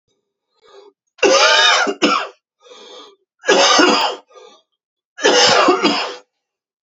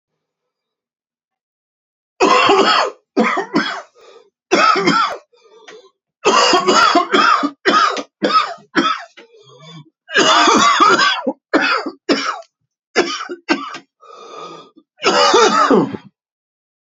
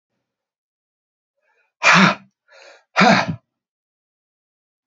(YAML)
three_cough_length: 6.8 s
three_cough_amplitude: 32768
three_cough_signal_mean_std_ratio: 0.53
cough_length: 16.9 s
cough_amplitude: 32768
cough_signal_mean_std_ratio: 0.56
exhalation_length: 4.9 s
exhalation_amplitude: 32768
exhalation_signal_mean_std_ratio: 0.29
survey_phase: alpha (2021-03-01 to 2021-08-12)
age: 45-64
gender: Male
wearing_mask: 'No'
symptom_cough_any: true
symptom_new_continuous_cough: true
symptom_fever_high_temperature: true
symptom_headache: true
symptom_onset: 3 days
smoker_status: Ex-smoker
respiratory_condition_asthma: false
respiratory_condition_other: false
recruitment_source: Test and Trace
submission_delay: 1 day
covid_test_result: Positive
covid_test_method: RT-qPCR
covid_ct_value: 17.1
covid_ct_gene: ORF1ab gene
covid_ct_mean: 17.7
covid_viral_load: 1500000 copies/ml
covid_viral_load_category: High viral load (>1M copies/ml)